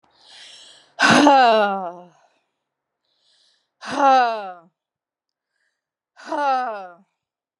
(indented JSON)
{
  "exhalation_length": "7.6 s",
  "exhalation_amplitude": 32001,
  "exhalation_signal_mean_std_ratio": 0.39,
  "survey_phase": "alpha (2021-03-01 to 2021-08-12)",
  "age": "45-64",
  "gender": "Female",
  "wearing_mask": "No",
  "symptom_cough_any": true,
  "symptom_fatigue": true,
  "symptom_headache": true,
  "symptom_onset": "9 days",
  "smoker_status": "Never smoked",
  "respiratory_condition_asthma": false,
  "respiratory_condition_other": false,
  "recruitment_source": "REACT",
  "submission_delay": "2 days",
  "covid_test_result": "Negative",
  "covid_test_method": "RT-qPCR"
}